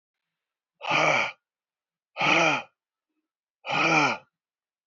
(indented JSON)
{
  "exhalation_length": "4.9 s",
  "exhalation_amplitude": 12921,
  "exhalation_signal_mean_std_ratio": 0.44,
  "survey_phase": "beta (2021-08-13 to 2022-03-07)",
  "age": "45-64",
  "gender": "Female",
  "wearing_mask": "No",
  "symptom_cough_any": true,
  "symptom_runny_or_blocked_nose": true,
  "symptom_shortness_of_breath": true,
  "symptom_sore_throat": true,
  "symptom_fatigue": true,
  "symptom_fever_high_temperature": true,
  "symptom_headache": true,
  "symptom_change_to_sense_of_smell_or_taste": true,
  "symptom_loss_of_taste": true,
  "smoker_status": "Current smoker (e-cigarettes or vapes only)",
  "respiratory_condition_asthma": false,
  "respiratory_condition_other": true,
  "recruitment_source": "Test and Trace",
  "submission_delay": "2 days",
  "covid_test_result": "Positive",
  "covid_test_method": "RT-qPCR",
  "covid_ct_value": 32.7,
  "covid_ct_gene": "ORF1ab gene"
}